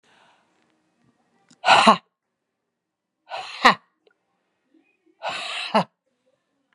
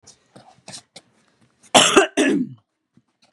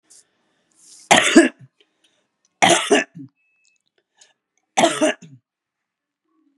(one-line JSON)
{"exhalation_length": "6.7 s", "exhalation_amplitude": 32767, "exhalation_signal_mean_std_ratio": 0.24, "cough_length": "3.3 s", "cough_amplitude": 32767, "cough_signal_mean_std_ratio": 0.34, "three_cough_length": "6.6 s", "three_cough_amplitude": 32768, "three_cough_signal_mean_std_ratio": 0.3, "survey_phase": "beta (2021-08-13 to 2022-03-07)", "age": "45-64", "gender": "Female", "wearing_mask": "No", "symptom_none": true, "symptom_onset": "12 days", "smoker_status": "Ex-smoker", "respiratory_condition_asthma": false, "respiratory_condition_other": false, "recruitment_source": "REACT", "submission_delay": "9 days", "covid_test_result": "Negative", "covid_test_method": "RT-qPCR", "influenza_a_test_result": "Unknown/Void", "influenza_b_test_result": "Unknown/Void"}